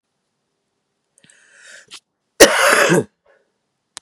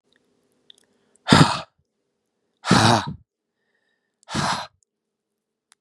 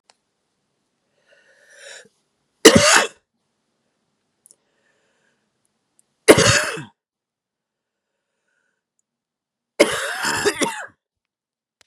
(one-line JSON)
{"cough_length": "4.0 s", "cough_amplitude": 32768, "cough_signal_mean_std_ratio": 0.3, "exhalation_length": "5.8 s", "exhalation_amplitude": 32768, "exhalation_signal_mean_std_ratio": 0.29, "three_cough_length": "11.9 s", "three_cough_amplitude": 32768, "three_cough_signal_mean_std_ratio": 0.25, "survey_phase": "beta (2021-08-13 to 2022-03-07)", "age": "18-44", "gender": "Male", "wearing_mask": "No", "symptom_cough_any": true, "symptom_onset": "4 days", "smoker_status": "Never smoked", "respiratory_condition_asthma": false, "respiratory_condition_other": false, "recruitment_source": "REACT", "submission_delay": "0 days", "covid_test_result": "Negative", "covid_test_method": "RT-qPCR", "influenza_a_test_result": "Negative", "influenza_b_test_result": "Negative"}